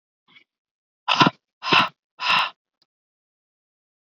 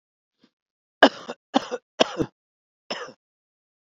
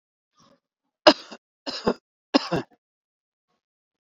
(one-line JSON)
{"exhalation_length": "4.2 s", "exhalation_amplitude": 30444, "exhalation_signal_mean_std_ratio": 0.3, "cough_length": "3.8 s", "cough_amplitude": 27964, "cough_signal_mean_std_ratio": 0.21, "three_cough_length": "4.0 s", "three_cough_amplitude": 28592, "three_cough_signal_mean_std_ratio": 0.2, "survey_phase": "beta (2021-08-13 to 2022-03-07)", "age": "45-64", "gender": "Male", "wearing_mask": "No", "symptom_runny_or_blocked_nose": true, "symptom_sore_throat": true, "symptom_diarrhoea": true, "symptom_fatigue": true, "smoker_status": "Never smoked", "respiratory_condition_asthma": false, "respiratory_condition_other": false, "recruitment_source": "REACT", "submission_delay": "4 days", "covid_test_result": "Negative", "covid_test_method": "RT-qPCR"}